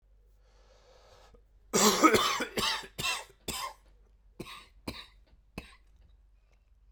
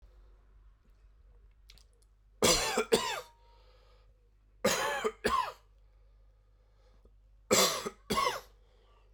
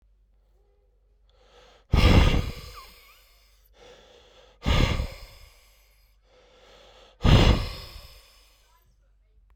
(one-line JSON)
{"cough_length": "6.9 s", "cough_amplitude": 13970, "cough_signal_mean_std_ratio": 0.36, "three_cough_length": "9.1 s", "three_cough_amplitude": 8672, "three_cough_signal_mean_std_ratio": 0.39, "exhalation_length": "9.6 s", "exhalation_amplitude": 18106, "exhalation_signal_mean_std_ratio": 0.33, "survey_phase": "beta (2021-08-13 to 2022-03-07)", "age": "18-44", "gender": "Male", "wearing_mask": "No", "symptom_cough_any": true, "symptom_shortness_of_breath": true, "symptom_sore_throat": true, "symptom_headache": true, "symptom_change_to_sense_of_smell_or_taste": true, "symptom_onset": "4 days", "smoker_status": "Ex-smoker", "respiratory_condition_asthma": false, "respiratory_condition_other": false, "recruitment_source": "Test and Trace", "submission_delay": "2 days", "covid_test_result": "Positive", "covid_test_method": "RT-qPCR", "covid_ct_value": 10.4, "covid_ct_gene": "ORF1ab gene", "covid_ct_mean": 10.7, "covid_viral_load": "300000000 copies/ml", "covid_viral_load_category": "High viral load (>1M copies/ml)"}